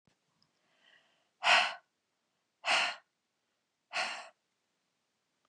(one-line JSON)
{"exhalation_length": "5.5 s", "exhalation_amplitude": 7883, "exhalation_signal_mean_std_ratio": 0.28, "survey_phase": "beta (2021-08-13 to 2022-03-07)", "age": "45-64", "gender": "Female", "wearing_mask": "No", "symptom_none": true, "smoker_status": "Never smoked", "respiratory_condition_asthma": false, "respiratory_condition_other": false, "recruitment_source": "REACT", "submission_delay": "1 day", "covid_test_result": "Negative", "covid_test_method": "RT-qPCR", "influenza_a_test_result": "Negative", "influenza_b_test_result": "Negative"}